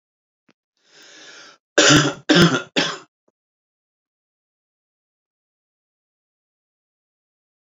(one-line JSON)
{"cough_length": "7.7 s", "cough_amplitude": 30921, "cough_signal_mean_std_ratio": 0.25, "survey_phase": "beta (2021-08-13 to 2022-03-07)", "age": "45-64", "gender": "Male", "wearing_mask": "No", "symptom_shortness_of_breath": true, "symptom_headache": true, "symptom_onset": "12 days", "smoker_status": "Never smoked", "respiratory_condition_asthma": true, "respiratory_condition_other": false, "recruitment_source": "REACT", "submission_delay": "1 day", "covid_test_result": "Negative", "covid_test_method": "RT-qPCR"}